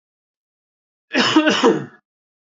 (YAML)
cough_length: 2.6 s
cough_amplitude: 26819
cough_signal_mean_std_ratio: 0.41
survey_phase: beta (2021-08-13 to 2022-03-07)
age: 18-44
gender: Male
wearing_mask: 'No'
symptom_none: true
smoker_status: Ex-smoker
respiratory_condition_asthma: false
respiratory_condition_other: false
recruitment_source: REACT
submission_delay: 6 days
covid_test_result: Negative
covid_test_method: RT-qPCR